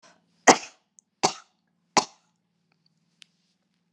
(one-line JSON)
{"three_cough_length": "3.9 s", "three_cough_amplitude": 31032, "three_cough_signal_mean_std_ratio": 0.16, "survey_phase": "beta (2021-08-13 to 2022-03-07)", "age": "65+", "gender": "Female", "wearing_mask": "No", "symptom_none": true, "symptom_onset": "13 days", "smoker_status": "Never smoked", "respiratory_condition_asthma": false, "respiratory_condition_other": false, "recruitment_source": "REACT", "submission_delay": "1 day", "covid_test_result": "Negative", "covid_test_method": "RT-qPCR"}